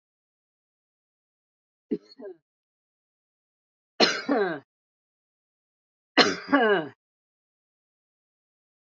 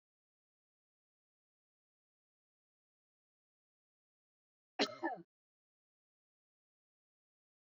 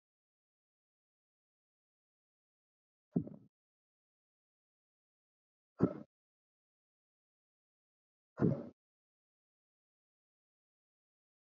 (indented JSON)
{
  "three_cough_length": "8.9 s",
  "three_cough_amplitude": 20516,
  "three_cough_signal_mean_std_ratio": 0.26,
  "cough_length": "7.8 s",
  "cough_amplitude": 3529,
  "cough_signal_mean_std_ratio": 0.13,
  "exhalation_length": "11.5 s",
  "exhalation_amplitude": 4515,
  "exhalation_signal_mean_std_ratio": 0.14,
  "survey_phase": "beta (2021-08-13 to 2022-03-07)",
  "age": "65+",
  "gender": "Female",
  "wearing_mask": "No",
  "symptom_shortness_of_breath": true,
  "smoker_status": "Never smoked",
  "respiratory_condition_asthma": false,
  "respiratory_condition_other": false,
  "recruitment_source": "REACT",
  "submission_delay": "2 days",
  "covid_test_result": "Negative",
  "covid_test_method": "RT-qPCR",
  "influenza_a_test_result": "Negative",
  "influenza_b_test_result": "Negative"
}